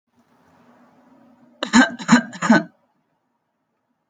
{
  "three_cough_length": "4.1 s",
  "three_cough_amplitude": 31860,
  "three_cough_signal_mean_std_ratio": 0.29,
  "survey_phase": "alpha (2021-03-01 to 2021-08-12)",
  "age": "18-44",
  "gender": "Male",
  "wearing_mask": "Yes",
  "symptom_none": true,
  "smoker_status": "Current smoker (e-cigarettes or vapes only)",
  "respiratory_condition_asthma": false,
  "respiratory_condition_other": false,
  "recruitment_source": "REACT",
  "submission_delay": "1 day",
  "covid_test_result": "Negative",
  "covid_test_method": "RT-qPCR"
}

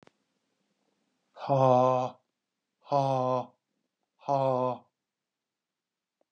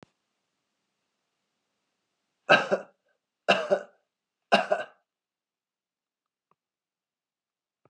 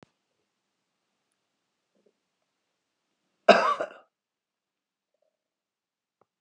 {
  "exhalation_length": "6.3 s",
  "exhalation_amplitude": 11258,
  "exhalation_signal_mean_std_ratio": 0.37,
  "three_cough_length": "7.9 s",
  "three_cough_amplitude": 21735,
  "three_cough_signal_mean_std_ratio": 0.22,
  "cough_length": "6.4 s",
  "cough_amplitude": 27325,
  "cough_signal_mean_std_ratio": 0.15,
  "survey_phase": "beta (2021-08-13 to 2022-03-07)",
  "age": "65+",
  "gender": "Male",
  "wearing_mask": "No",
  "symptom_cough_any": true,
  "symptom_runny_or_blocked_nose": true,
  "symptom_fatigue": true,
  "symptom_other": true,
  "symptom_onset": "5 days",
  "smoker_status": "Current smoker (e-cigarettes or vapes only)",
  "respiratory_condition_asthma": false,
  "respiratory_condition_other": false,
  "recruitment_source": "Test and Trace",
  "submission_delay": "1 day",
  "covid_test_result": "Positive",
  "covid_test_method": "RT-qPCR",
  "covid_ct_value": 18.0,
  "covid_ct_gene": "ORF1ab gene",
  "covid_ct_mean": 19.1,
  "covid_viral_load": "530000 copies/ml",
  "covid_viral_load_category": "Low viral load (10K-1M copies/ml)"
}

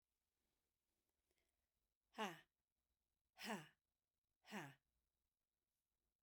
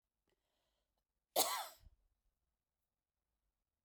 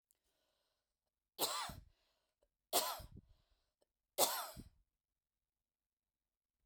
{
  "exhalation_length": "6.2 s",
  "exhalation_amplitude": 590,
  "exhalation_signal_mean_std_ratio": 0.25,
  "cough_length": "3.8 s",
  "cough_amplitude": 3379,
  "cough_signal_mean_std_ratio": 0.21,
  "three_cough_length": "6.7 s",
  "three_cough_amplitude": 4949,
  "three_cough_signal_mean_std_ratio": 0.27,
  "survey_phase": "beta (2021-08-13 to 2022-03-07)",
  "age": "45-64",
  "gender": "Female",
  "wearing_mask": "No",
  "symptom_none": true,
  "symptom_onset": "2 days",
  "smoker_status": "Never smoked",
  "respiratory_condition_asthma": true,
  "respiratory_condition_other": false,
  "recruitment_source": "REACT",
  "submission_delay": "2 days",
  "covid_test_result": "Negative",
  "covid_test_method": "RT-qPCR"
}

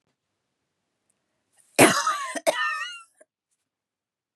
{
  "cough_length": "4.4 s",
  "cough_amplitude": 27829,
  "cough_signal_mean_std_ratio": 0.3,
  "survey_phase": "beta (2021-08-13 to 2022-03-07)",
  "age": "45-64",
  "gender": "Female",
  "wearing_mask": "No",
  "symptom_none": true,
  "smoker_status": "Never smoked",
  "respiratory_condition_asthma": false,
  "respiratory_condition_other": false,
  "recruitment_source": "REACT",
  "submission_delay": "1 day",
  "covid_test_result": "Negative",
  "covid_test_method": "RT-qPCR",
  "influenza_a_test_result": "Negative",
  "influenza_b_test_result": "Negative"
}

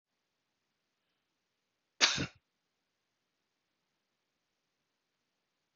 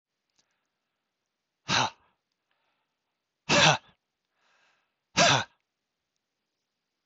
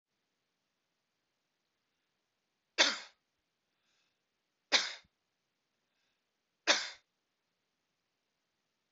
{
  "cough_length": "5.8 s",
  "cough_amplitude": 11220,
  "cough_signal_mean_std_ratio": 0.14,
  "exhalation_length": "7.1 s",
  "exhalation_amplitude": 15873,
  "exhalation_signal_mean_std_ratio": 0.25,
  "three_cough_length": "8.9 s",
  "three_cough_amplitude": 8042,
  "three_cough_signal_mean_std_ratio": 0.18,
  "survey_phase": "beta (2021-08-13 to 2022-03-07)",
  "age": "45-64",
  "gender": "Male",
  "wearing_mask": "No",
  "symptom_sore_throat": true,
  "symptom_onset": "3 days",
  "smoker_status": "Never smoked",
  "respiratory_condition_asthma": false,
  "respiratory_condition_other": false,
  "recruitment_source": "REACT",
  "submission_delay": "2 days",
  "covid_test_result": "Negative",
  "covid_test_method": "RT-qPCR",
  "influenza_a_test_result": "Negative",
  "influenza_b_test_result": "Negative"
}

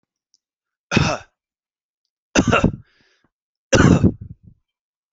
{
  "three_cough_length": "5.1 s",
  "three_cough_amplitude": 27673,
  "three_cough_signal_mean_std_ratio": 0.33,
  "survey_phase": "alpha (2021-03-01 to 2021-08-12)",
  "age": "45-64",
  "gender": "Male",
  "wearing_mask": "No",
  "symptom_cough_any": true,
  "smoker_status": "Never smoked",
  "respiratory_condition_asthma": false,
  "respiratory_condition_other": false,
  "recruitment_source": "REACT",
  "submission_delay": "1 day",
  "covid_test_result": "Negative",
  "covid_test_method": "RT-qPCR"
}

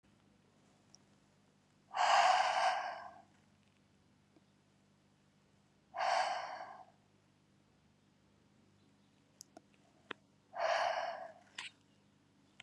{
  "exhalation_length": "12.6 s",
  "exhalation_amplitude": 4194,
  "exhalation_signal_mean_std_ratio": 0.36,
  "survey_phase": "beta (2021-08-13 to 2022-03-07)",
  "age": "18-44",
  "gender": "Female",
  "wearing_mask": "No",
  "symptom_runny_or_blocked_nose": true,
  "symptom_sore_throat": true,
  "symptom_abdominal_pain": true,
  "symptom_fatigue": true,
  "symptom_fever_high_temperature": true,
  "symptom_headache": true,
  "symptom_change_to_sense_of_smell_or_taste": true,
  "symptom_loss_of_taste": true,
  "symptom_onset": "3 days",
  "smoker_status": "Never smoked",
  "respiratory_condition_asthma": false,
  "respiratory_condition_other": false,
  "recruitment_source": "Test and Trace",
  "submission_delay": "1 day",
  "covid_test_result": "Positive",
  "covid_test_method": "RT-qPCR",
  "covid_ct_value": 24.8,
  "covid_ct_gene": "ORF1ab gene"
}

